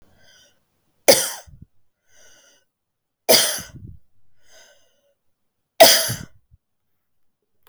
three_cough_length: 7.7 s
three_cough_amplitude: 32768
three_cough_signal_mean_std_ratio: 0.25
survey_phase: beta (2021-08-13 to 2022-03-07)
age: 45-64
gender: Female
wearing_mask: 'No'
symptom_none: true
smoker_status: Ex-smoker
respiratory_condition_asthma: true
respiratory_condition_other: true
recruitment_source: REACT
submission_delay: 2 days
covid_test_result: Negative
covid_test_method: RT-qPCR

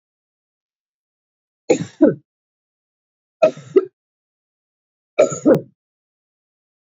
three_cough_length: 6.8 s
three_cough_amplitude: 30731
three_cough_signal_mean_std_ratio: 0.24
survey_phase: beta (2021-08-13 to 2022-03-07)
age: 45-64
gender: Female
wearing_mask: 'No'
symptom_cough_any: true
symptom_runny_or_blocked_nose: true
symptom_sore_throat: true
symptom_fatigue: true
symptom_headache: true
symptom_change_to_sense_of_smell_or_taste: true
symptom_onset: 3 days
smoker_status: Never smoked
respiratory_condition_asthma: false
respiratory_condition_other: false
recruitment_source: Test and Trace
submission_delay: 1 day
covid_test_result: Positive
covid_test_method: ePCR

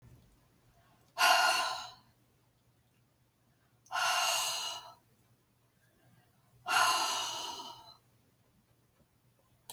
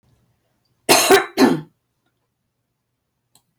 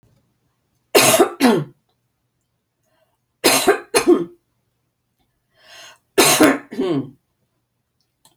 exhalation_length: 9.7 s
exhalation_amplitude: 7306
exhalation_signal_mean_std_ratio: 0.4
cough_length: 3.6 s
cough_amplitude: 31651
cough_signal_mean_std_ratio: 0.31
three_cough_length: 8.4 s
three_cough_amplitude: 32768
three_cough_signal_mean_std_ratio: 0.37
survey_phase: beta (2021-08-13 to 2022-03-07)
age: 65+
gender: Female
wearing_mask: 'No'
symptom_none: true
smoker_status: Never smoked
respiratory_condition_asthma: false
respiratory_condition_other: false
recruitment_source: REACT
submission_delay: 2 days
covid_test_result: Negative
covid_test_method: RT-qPCR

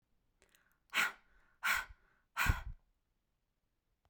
exhalation_length: 4.1 s
exhalation_amplitude: 4117
exhalation_signal_mean_std_ratio: 0.32
survey_phase: beta (2021-08-13 to 2022-03-07)
age: 18-44
gender: Female
wearing_mask: 'No'
symptom_none: true
smoker_status: Current smoker (1 to 10 cigarettes per day)
respiratory_condition_asthma: false
respiratory_condition_other: false
recruitment_source: REACT
submission_delay: 2 days
covid_test_result: Negative
covid_test_method: RT-qPCR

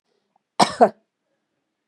cough_length: 1.9 s
cough_amplitude: 32292
cough_signal_mean_std_ratio: 0.23
survey_phase: beta (2021-08-13 to 2022-03-07)
age: 45-64
gender: Female
wearing_mask: 'No'
symptom_none: true
smoker_status: Never smoked
respiratory_condition_asthma: false
respiratory_condition_other: false
recruitment_source: REACT
submission_delay: 0 days
covid_test_result: Negative
covid_test_method: RT-qPCR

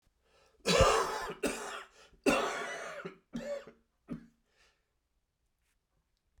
cough_length: 6.4 s
cough_amplitude: 8015
cough_signal_mean_std_ratio: 0.4
survey_phase: beta (2021-08-13 to 2022-03-07)
age: 45-64
gender: Male
wearing_mask: 'No'
symptom_cough_any: true
symptom_shortness_of_breath: true
symptom_diarrhoea: true
symptom_fatigue: true
symptom_change_to_sense_of_smell_or_taste: true
symptom_onset: 6 days
smoker_status: Ex-smoker
respiratory_condition_asthma: false
respiratory_condition_other: false
recruitment_source: Test and Trace
submission_delay: 1 day
covid_test_result: Positive
covid_test_method: RT-qPCR
covid_ct_value: 14.8
covid_ct_gene: ORF1ab gene
covid_ct_mean: 15.2
covid_viral_load: 10000000 copies/ml
covid_viral_load_category: High viral load (>1M copies/ml)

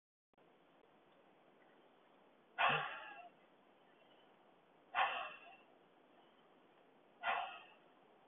exhalation_length: 8.3 s
exhalation_amplitude: 2735
exhalation_signal_mean_std_ratio: 0.33
survey_phase: beta (2021-08-13 to 2022-03-07)
age: 45-64
gender: Female
wearing_mask: 'No'
symptom_none: true
smoker_status: Never smoked
respiratory_condition_asthma: false
respiratory_condition_other: false
recruitment_source: REACT
submission_delay: 4 days
covid_test_result: Negative
covid_test_method: RT-qPCR
influenza_a_test_result: Negative
influenza_b_test_result: Negative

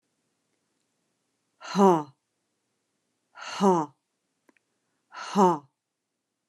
exhalation_length: 6.5 s
exhalation_amplitude: 14721
exhalation_signal_mean_std_ratio: 0.28
survey_phase: alpha (2021-03-01 to 2021-08-12)
age: 45-64
gender: Female
wearing_mask: 'Yes'
symptom_none: true
smoker_status: Never smoked
respiratory_condition_asthma: false
respiratory_condition_other: false
recruitment_source: REACT
submission_delay: 4 days
covid_test_result: Negative
covid_test_method: RT-qPCR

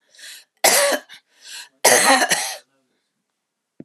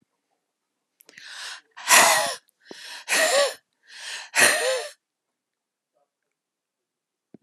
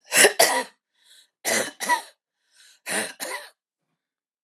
cough_length: 3.8 s
cough_amplitude: 32516
cough_signal_mean_std_ratio: 0.42
exhalation_length: 7.4 s
exhalation_amplitude: 27460
exhalation_signal_mean_std_ratio: 0.36
three_cough_length: 4.4 s
three_cough_amplitude: 32167
three_cough_signal_mean_std_ratio: 0.37
survey_phase: alpha (2021-03-01 to 2021-08-12)
age: 45-64
gender: Female
wearing_mask: 'No'
symptom_cough_any: true
symptom_shortness_of_breath: true
symptom_fatigue: true
symptom_fever_high_temperature: true
symptom_headache: true
symptom_onset: 3 days
smoker_status: Never smoked
respiratory_condition_asthma: false
respiratory_condition_other: false
recruitment_source: Test and Trace
submission_delay: 2 days
covid_test_result: Positive
covid_test_method: RT-qPCR
covid_ct_value: 37.3
covid_ct_gene: N gene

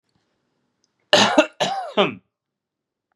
cough_length: 3.2 s
cough_amplitude: 32064
cough_signal_mean_std_ratio: 0.34
survey_phase: beta (2021-08-13 to 2022-03-07)
age: 18-44
gender: Male
wearing_mask: 'No'
symptom_cough_any: true
symptom_runny_or_blocked_nose: true
symptom_sore_throat: true
symptom_fatigue: true
symptom_fever_high_temperature: true
symptom_headache: true
symptom_onset: 3 days
smoker_status: Never smoked
respiratory_condition_asthma: false
respiratory_condition_other: false
recruitment_source: Test and Trace
submission_delay: 2 days
covid_test_result: Positive
covid_test_method: ePCR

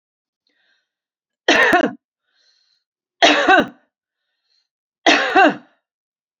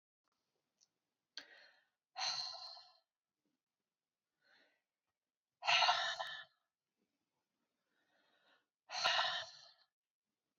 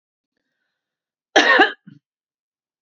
three_cough_length: 6.4 s
three_cough_amplitude: 32767
three_cough_signal_mean_std_ratio: 0.36
exhalation_length: 10.6 s
exhalation_amplitude: 3694
exhalation_signal_mean_std_ratio: 0.3
cough_length: 2.8 s
cough_amplitude: 27441
cough_signal_mean_std_ratio: 0.27
survey_phase: beta (2021-08-13 to 2022-03-07)
age: 45-64
gender: Female
wearing_mask: 'No'
symptom_none: true
smoker_status: Ex-smoker
respiratory_condition_asthma: false
respiratory_condition_other: false
recruitment_source: REACT
submission_delay: 10 days
covid_test_result: Negative
covid_test_method: RT-qPCR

